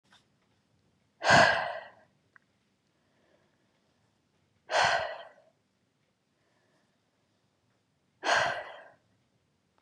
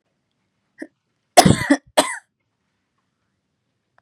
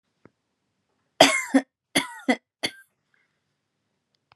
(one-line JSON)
{"exhalation_length": "9.8 s", "exhalation_amplitude": 12319, "exhalation_signal_mean_std_ratio": 0.27, "cough_length": "4.0 s", "cough_amplitude": 32768, "cough_signal_mean_std_ratio": 0.23, "three_cough_length": "4.4 s", "three_cough_amplitude": 32398, "three_cough_signal_mean_std_ratio": 0.24, "survey_phase": "beta (2021-08-13 to 2022-03-07)", "age": "18-44", "gender": "Female", "wearing_mask": "No", "symptom_runny_or_blocked_nose": true, "symptom_headache": true, "symptom_onset": "12 days", "smoker_status": "Never smoked", "respiratory_condition_asthma": false, "respiratory_condition_other": false, "recruitment_source": "REACT", "submission_delay": "2 days", "covid_test_result": "Negative", "covid_test_method": "RT-qPCR", "influenza_a_test_result": "Negative", "influenza_b_test_result": "Negative"}